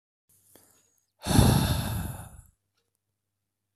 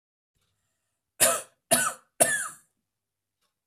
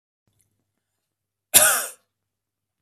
{"exhalation_length": "3.8 s", "exhalation_amplitude": 16641, "exhalation_signal_mean_std_ratio": 0.36, "three_cough_length": "3.7 s", "three_cough_amplitude": 25177, "three_cough_signal_mean_std_ratio": 0.31, "cough_length": "2.8 s", "cough_amplitude": 32768, "cough_signal_mean_std_ratio": 0.24, "survey_phase": "beta (2021-08-13 to 2022-03-07)", "age": "18-44", "gender": "Male", "wearing_mask": "No", "symptom_none": true, "smoker_status": "Never smoked", "respiratory_condition_asthma": false, "respiratory_condition_other": false, "recruitment_source": "REACT", "submission_delay": "3 days", "covid_test_result": "Negative", "covid_test_method": "RT-qPCR", "influenza_a_test_result": "Unknown/Void", "influenza_b_test_result": "Unknown/Void"}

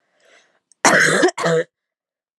{"cough_length": "2.4 s", "cough_amplitude": 32768, "cough_signal_mean_std_ratio": 0.46, "survey_phase": "alpha (2021-03-01 to 2021-08-12)", "age": "18-44", "gender": "Female", "wearing_mask": "No", "symptom_cough_any": true, "symptom_headache": true, "smoker_status": "Never smoked", "respiratory_condition_asthma": false, "respiratory_condition_other": false, "recruitment_source": "Test and Trace", "submission_delay": "1 day", "covid_test_result": "Positive", "covid_test_method": "RT-qPCR"}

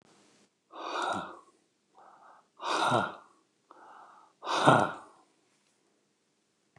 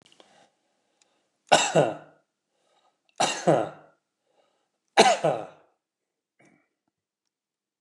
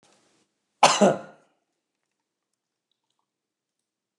{"exhalation_length": "6.8 s", "exhalation_amplitude": 19360, "exhalation_signal_mean_std_ratio": 0.34, "three_cough_length": "7.8 s", "three_cough_amplitude": 26012, "three_cough_signal_mean_std_ratio": 0.28, "cough_length": "4.2 s", "cough_amplitude": 27042, "cough_signal_mean_std_ratio": 0.2, "survey_phase": "beta (2021-08-13 to 2022-03-07)", "age": "65+", "gender": "Male", "wearing_mask": "No", "symptom_none": true, "smoker_status": "Never smoked", "respiratory_condition_asthma": false, "respiratory_condition_other": false, "recruitment_source": "REACT", "submission_delay": "1 day", "covid_test_result": "Negative", "covid_test_method": "RT-qPCR"}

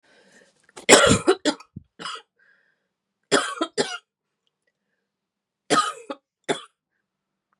{"three_cough_length": "7.6 s", "three_cough_amplitude": 32768, "three_cough_signal_mean_std_ratio": 0.29, "survey_phase": "beta (2021-08-13 to 2022-03-07)", "age": "45-64", "gender": "Female", "wearing_mask": "No", "symptom_cough_any": true, "symptom_new_continuous_cough": true, "symptom_runny_or_blocked_nose": true, "symptom_sore_throat": true, "symptom_fatigue": true, "symptom_headache": true, "smoker_status": "Never smoked", "respiratory_condition_asthma": false, "respiratory_condition_other": false, "recruitment_source": "Test and Trace", "submission_delay": "2 days", "covid_test_result": "Positive", "covid_test_method": "LFT"}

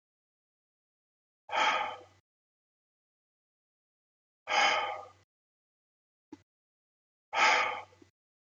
{"exhalation_length": "8.5 s", "exhalation_amplitude": 8275, "exhalation_signal_mean_std_ratio": 0.31, "survey_phase": "beta (2021-08-13 to 2022-03-07)", "age": "45-64", "gender": "Male", "wearing_mask": "No", "symptom_none": true, "smoker_status": "Never smoked", "respiratory_condition_asthma": false, "respiratory_condition_other": false, "recruitment_source": "REACT", "submission_delay": "5 days", "covid_test_result": "Negative", "covid_test_method": "RT-qPCR"}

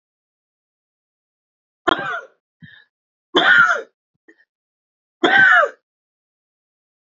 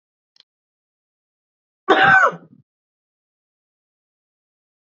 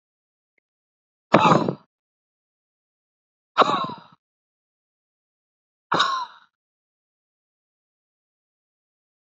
{"three_cough_length": "7.1 s", "three_cough_amplitude": 32767, "three_cough_signal_mean_std_ratio": 0.32, "cough_length": "4.9 s", "cough_amplitude": 30764, "cough_signal_mean_std_ratio": 0.24, "exhalation_length": "9.4 s", "exhalation_amplitude": 27345, "exhalation_signal_mean_std_ratio": 0.23, "survey_phase": "beta (2021-08-13 to 2022-03-07)", "age": "45-64", "gender": "Male", "wearing_mask": "No", "symptom_none": true, "smoker_status": "Never smoked", "respiratory_condition_asthma": true, "respiratory_condition_other": false, "recruitment_source": "REACT", "submission_delay": "3 days", "covid_test_result": "Negative", "covid_test_method": "RT-qPCR", "influenza_a_test_result": "Negative", "influenza_b_test_result": "Negative"}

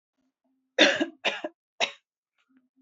{"three_cough_length": "2.8 s", "three_cough_amplitude": 19025, "three_cough_signal_mean_std_ratio": 0.3, "survey_phase": "alpha (2021-03-01 to 2021-08-12)", "age": "18-44", "gender": "Female", "wearing_mask": "No", "symptom_none": true, "smoker_status": "Never smoked", "respiratory_condition_asthma": false, "respiratory_condition_other": false, "recruitment_source": "REACT", "submission_delay": "1 day", "covid_test_result": "Negative", "covid_test_method": "RT-qPCR"}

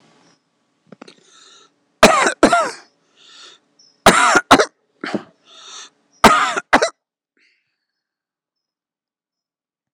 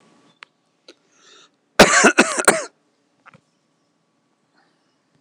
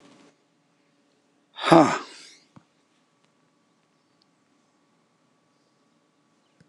{"three_cough_length": "9.9 s", "three_cough_amplitude": 26028, "three_cough_signal_mean_std_ratio": 0.31, "cough_length": "5.2 s", "cough_amplitude": 26028, "cough_signal_mean_std_ratio": 0.26, "exhalation_length": "6.7 s", "exhalation_amplitude": 26028, "exhalation_signal_mean_std_ratio": 0.17, "survey_phase": "beta (2021-08-13 to 2022-03-07)", "age": "45-64", "gender": "Male", "wearing_mask": "No", "symptom_none": true, "symptom_onset": "6 days", "smoker_status": "Never smoked", "respiratory_condition_asthma": false, "respiratory_condition_other": false, "recruitment_source": "REACT", "submission_delay": "2 days", "covid_test_result": "Negative", "covid_test_method": "RT-qPCR"}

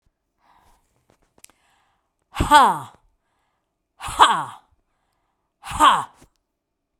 {"exhalation_length": "7.0 s", "exhalation_amplitude": 32767, "exhalation_signal_mean_std_ratio": 0.28, "survey_phase": "beta (2021-08-13 to 2022-03-07)", "age": "65+", "gender": "Female", "wearing_mask": "No", "symptom_none": true, "smoker_status": "Ex-smoker", "respiratory_condition_asthma": false, "respiratory_condition_other": false, "recruitment_source": "REACT", "submission_delay": "1 day", "covid_test_result": "Negative", "covid_test_method": "RT-qPCR"}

